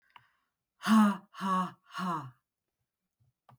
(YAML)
exhalation_length: 3.6 s
exhalation_amplitude: 7712
exhalation_signal_mean_std_ratio: 0.38
survey_phase: beta (2021-08-13 to 2022-03-07)
age: 45-64
gender: Female
wearing_mask: 'No'
symptom_none: true
smoker_status: Ex-smoker
respiratory_condition_asthma: false
respiratory_condition_other: false
recruitment_source: REACT
submission_delay: 1 day
covid_test_result: Negative
covid_test_method: RT-qPCR
influenza_a_test_result: Negative
influenza_b_test_result: Negative